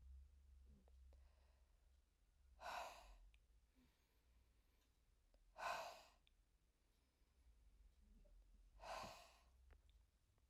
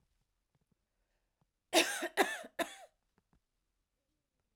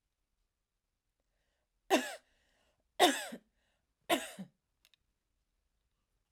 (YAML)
exhalation_length: 10.5 s
exhalation_amplitude: 479
exhalation_signal_mean_std_ratio: 0.48
cough_length: 4.6 s
cough_amplitude: 7271
cough_signal_mean_std_ratio: 0.25
three_cough_length: 6.3 s
three_cough_amplitude: 7622
three_cough_signal_mean_std_ratio: 0.22
survey_phase: beta (2021-08-13 to 2022-03-07)
age: 45-64
gender: Female
wearing_mask: 'No'
symptom_sore_throat: true
smoker_status: Current smoker (e-cigarettes or vapes only)
respiratory_condition_asthma: true
respiratory_condition_other: false
recruitment_source: REACT
submission_delay: 2 days
covid_test_result: Negative
covid_test_method: RT-qPCR